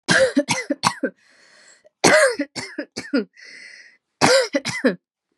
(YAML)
three_cough_length: 5.4 s
three_cough_amplitude: 32767
three_cough_signal_mean_std_ratio: 0.47
survey_phase: beta (2021-08-13 to 2022-03-07)
age: 18-44
gender: Female
wearing_mask: 'No'
symptom_none: true
smoker_status: Never smoked
respiratory_condition_asthma: false
respiratory_condition_other: false
recruitment_source: REACT
submission_delay: 2 days
covid_test_result: Negative
covid_test_method: RT-qPCR